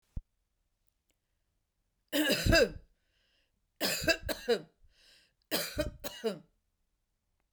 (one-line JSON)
{"three_cough_length": "7.5 s", "three_cough_amplitude": 9689, "three_cough_signal_mean_std_ratio": 0.35, "survey_phase": "beta (2021-08-13 to 2022-03-07)", "age": "45-64", "gender": "Female", "wearing_mask": "No", "symptom_none": true, "smoker_status": "Never smoked", "respiratory_condition_asthma": false, "respiratory_condition_other": false, "recruitment_source": "Test and Trace", "submission_delay": "1 day", "covid_test_result": "Negative", "covid_test_method": "RT-qPCR"}